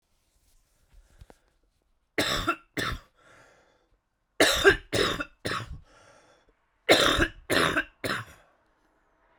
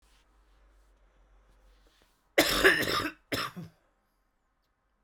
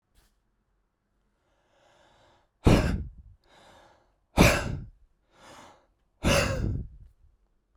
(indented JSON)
{
  "three_cough_length": "9.4 s",
  "three_cough_amplitude": 19003,
  "three_cough_signal_mean_std_ratio": 0.37,
  "cough_length": "5.0 s",
  "cough_amplitude": 12905,
  "cough_signal_mean_std_ratio": 0.32,
  "exhalation_length": "7.8 s",
  "exhalation_amplitude": 18716,
  "exhalation_signal_mean_std_ratio": 0.31,
  "survey_phase": "beta (2021-08-13 to 2022-03-07)",
  "age": "18-44",
  "gender": "Male",
  "wearing_mask": "No",
  "symptom_cough_any": true,
  "symptom_new_continuous_cough": true,
  "symptom_runny_or_blocked_nose": true,
  "symptom_shortness_of_breath": true,
  "symptom_fatigue": true,
  "symptom_headache": true,
  "symptom_change_to_sense_of_smell_or_taste": true,
  "symptom_onset": "2 days",
  "smoker_status": "Never smoked",
  "respiratory_condition_asthma": true,
  "respiratory_condition_other": false,
  "recruitment_source": "Test and Trace",
  "submission_delay": "2 days",
  "covid_test_result": "Positive",
  "covid_test_method": "LAMP"
}